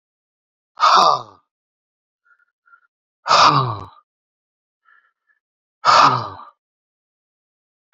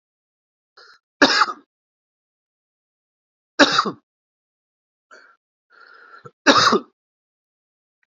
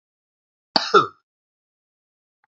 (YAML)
exhalation_length: 7.9 s
exhalation_amplitude: 32767
exhalation_signal_mean_std_ratio: 0.32
three_cough_length: 8.1 s
three_cough_amplitude: 28865
three_cough_signal_mean_std_ratio: 0.25
cough_length: 2.5 s
cough_amplitude: 28121
cough_signal_mean_std_ratio: 0.2
survey_phase: beta (2021-08-13 to 2022-03-07)
age: 45-64
gender: Male
wearing_mask: 'No'
symptom_cough_any: true
symptom_runny_or_blocked_nose: true
symptom_fatigue: true
symptom_headache: true
symptom_onset: 3 days
smoker_status: Ex-smoker
respiratory_condition_asthma: false
respiratory_condition_other: false
recruitment_source: Test and Trace
submission_delay: 2 days
covid_test_result: Positive
covid_test_method: RT-qPCR
covid_ct_value: 21.5
covid_ct_gene: ORF1ab gene
covid_ct_mean: 21.9
covid_viral_load: 65000 copies/ml
covid_viral_load_category: Low viral load (10K-1M copies/ml)